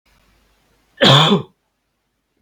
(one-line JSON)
{"cough_length": "2.4 s", "cough_amplitude": 32768, "cough_signal_mean_std_ratio": 0.33, "survey_phase": "beta (2021-08-13 to 2022-03-07)", "age": "18-44", "gender": "Male", "wearing_mask": "No", "symptom_none": true, "smoker_status": "Never smoked", "respiratory_condition_asthma": false, "respiratory_condition_other": false, "recruitment_source": "REACT", "submission_delay": "0 days", "covid_test_result": "Negative", "covid_test_method": "RT-qPCR", "covid_ct_value": 42.0, "covid_ct_gene": "N gene"}